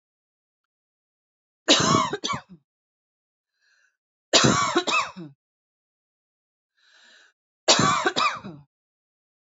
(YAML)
three_cough_length: 9.6 s
three_cough_amplitude: 26050
three_cough_signal_mean_std_ratio: 0.35
survey_phase: beta (2021-08-13 to 2022-03-07)
age: 45-64
gender: Female
wearing_mask: 'No'
symptom_none: true
smoker_status: Never smoked
respiratory_condition_asthma: false
respiratory_condition_other: false
recruitment_source: REACT
submission_delay: 1 day
covid_test_result: Negative
covid_test_method: RT-qPCR
influenza_a_test_result: Negative
influenza_b_test_result: Negative